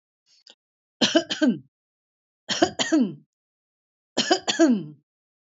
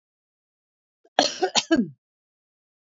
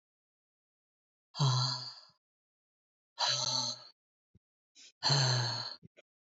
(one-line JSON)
{"three_cough_length": "5.5 s", "three_cough_amplitude": 19761, "three_cough_signal_mean_std_ratio": 0.39, "cough_length": "2.9 s", "cough_amplitude": 26961, "cough_signal_mean_std_ratio": 0.29, "exhalation_length": "6.4 s", "exhalation_amplitude": 5891, "exhalation_signal_mean_std_ratio": 0.43, "survey_phase": "alpha (2021-03-01 to 2021-08-12)", "age": "45-64", "gender": "Female", "wearing_mask": "No", "symptom_none": true, "smoker_status": "Ex-smoker", "respiratory_condition_asthma": false, "respiratory_condition_other": false, "recruitment_source": "REACT", "submission_delay": "1 day", "covid_test_result": "Negative", "covid_test_method": "RT-qPCR"}